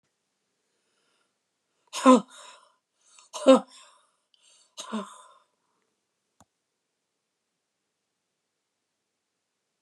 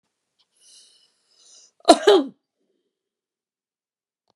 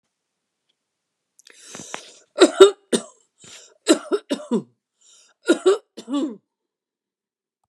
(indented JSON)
{
  "exhalation_length": "9.8 s",
  "exhalation_amplitude": 22627,
  "exhalation_signal_mean_std_ratio": 0.16,
  "cough_length": "4.4 s",
  "cough_amplitude": 32768,
  "cough_signal_mean_std_ratio": 0.2,
  "three_cough_length": "7.7 s",
  "three_cough_amplitude": 32768,
  "three_cough_signal_mean_std_ratio": 0.26,
  "survey_phase": "beta (2021-08-13 to 2022-03-07)",
  "age": "65+",
  "gender": "Female",
  "wearing_mask": "No",
  "symptom_none": true,
  "smoker_status": "Never smoked",
  "respiratory_condition_asthma": true,
  "respiratory_condition_other": false,
  "recruitment_source": "REACT",
  "submission_delay": "1 day",
  "covid_test_result": "Negative",
  "covid_test_method": "RT-qPCR"
}